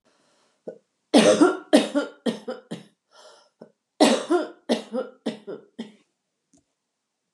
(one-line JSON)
{"cough_length": "7.3 s", "cough_amplitude": 25670, "cough_signal_mean_std_ratio": 0.35, "survey_phase": "alpha (2021-03-01 to 2021-08-12)", "age": "45-64", "gender": "Female", "wearing_mask": "No", "symptom_none": true, "smoker_status": "Never smoked", "respiratory_condition_asthma": false, "respiratory_condition_other": false, "recruitment_source": "REACT", "submission_delay": "3 days", "covid_test_result": "Negative", "covid_test_method": "RT-qPCR"}